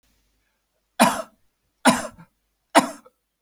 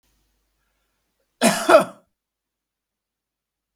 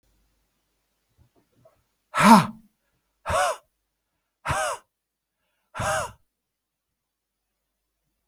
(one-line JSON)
{"three_cough_length": "3.4 s", "three_cough_amplitude": 32768, "three_cough_signal_mean_std_ratio": 0.27, "cough_length": "3.8 s", "cough_amplitude": 32768, "cough_signal_mean_std_ratio": 0.22, "exhalation_length": "8.3 s", "exhalation_amplitude": 29035, "exhalation_signal_mean_std_ratio": 0.25, "survey_phase": "beta (2021-08-13 to 2022-03-07)", "age": "65+", "gender": "Male", "wearing_mask": "No", "symptom_none": true, "smoker_status": "Never smoked", "respiratory_condition_asthma": false, "respiratory_condition_other": false, "recruitment_source": "REACT", "submission_delay": "3 days", "covid_test_result": "Negative", "covid_test_method": "RT-qPCR", "influenza_a_test_result": "Unknown/Void", "influenza_b_test_result": "Unknown/Void"}